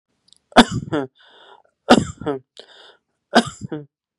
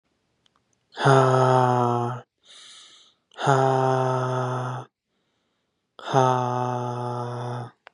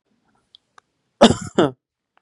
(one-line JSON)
{"three_cough_length": "4.2 s", "three_cough_amplitude": 32768, "three_cough_signal_mean_std_ratio": 0.28, "exhalation_length": "7.9 s", "exhalation_amplitude": 24860, "exhalation_signal_mean_std_ratio": 0.55, "cough_length": "2.2 s", "cough_amplitude": 32768, "cough_signal_mean_std_ratio": 0.25, "survey_phase": "beta (2021-08-13 to 2022-03-07)", "age": "18-44", "gender": "Male", "wearing_mask": "No", "symptom_sore_throat": true, "symptom_headache": true, "smoker_status": "Never smoked", "respiratory_condition_asthma": true, "respiratory_condition_other": false, "recruitment_source": "Test and Trace", "submission_delay": "2 days", "covid_test_result": "Positive", "covid_test_method": "LFT"}